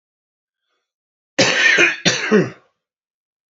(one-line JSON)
{"cough_length": "3.5 s", "cough_amplitude": 29487, "cough_signal_mean_std_ratio": 0.42, "survey_phase": "beta (2021-08-13 to 2022-03-07)", "age": "18-44", "gender": "Male", "wearing_mask": "Yes", "symptom_cough_any": true, "symptom_headache": true, "symptom_change_to_sense_of_smell_or_taste": true, "symptom_other": true, "symptom_onset": "3 days", "smoker_status": "Current smoker (1 to 10 cigarettes per day)", "respiratory_condition_asthma": false, "respiratory_condition_other": false, "recruitment_source": "Test and Trace", "submission_delay": "1 day", "covid_test_result": "Positive", "covid_test_method": "RT-qPCR", "covid_ct_value": 18.1, "covid_ct_gene": "ORF1ab gene", "covid_ct_mean": 18.4, "covid_viral_load": "930000 copies/ml", "covid_viral_load_category": "Low viral load (10K-1M copies/ml)"}